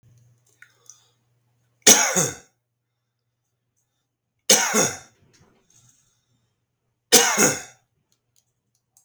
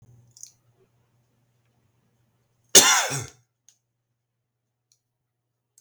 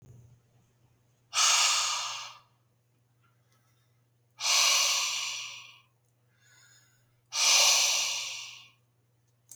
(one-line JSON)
{"three_cough_length": "9.0 s", "three_cough_amplitude": 32768, "three_cough_signal_mean_std_ratio": 0.27, "cough_length": "5.8 s", "cough_amplitude": 32768, "cough_signal_mean_std_ratio": 0.19, "exhalation_length": "9.6 s", "exhalation_amplitude": 11225, "exhalation_signal_mean_std_ratio": 0.46, "survey_phase": "beta (2021-08-13 to 2022-03-07)", "age": "45-64", "gender": "Male", "wearing_mask": "No", "symptom_none": true, "smoker_status": "Never smoked", "respiratory_condition_asthma": false, "respiratory_condition_other": false, "recruitment_source": "REACT", "submission_delay": "8 days", "covid_test_result": "Negative", "covid_test_method": "RT-qPCR"}